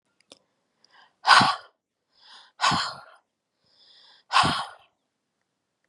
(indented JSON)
{
  "exhalation_length": "5.9 s",
  "exhalation_amplitude": 30862,
  "exhalation_signal_mean_std_ratio": 0.29,
  "survey_phase": "beta (2021-08-13 to 2022-03-07)",
  "age": "18-44",
  "gender": "Female",
  "wearing_mask": "No",
  "symptom_none": true,
  "smoker_status": "Never smoked",
  "respiratory_condition_asthma": true,
  "respiratory_condition_other": false,
  "recruitment_source": "REACT",
  "submission_delay": "1 day",
  "covid_test_result": "Negative",
  "covid_test_method": "RT-qPCR",
  "influenza_a_test_result": "Unknown/Void",
  "influenza_b_test_result": "Unknown/Void"
}